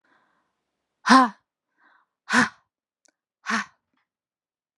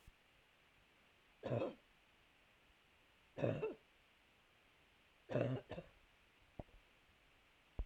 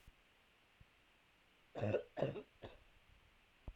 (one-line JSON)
{"exhalation_length": "4.8 s", "exhalation_amplitude": 30967, "exhalation_signal_mean_std_ratio": 0.24, "three_cough_length": "7.9 s", "three_cough_amplitude": 2107, "three_cough_signal_mean_std_ratio": 0.34, "cough_length": "3.8 s", "cough_amplitude": 2427, "cough_signal_mean_std_ratio": 0.35, "survey_phase": "alpha (2021-03-01 to 2021-08-12)", "age": "18-44", "gender": "Female", "wearing_mask": "No", "symptom_none": true, "smoker_status": "Never smoked", "respiratory_condition_asthma": true, "respiratory_condition_other": false, "recruitment_source": "REACT", "submission_delay": "1 day", "covid_test_result": "Negative", "covid_test_method": "RT-qPCR"}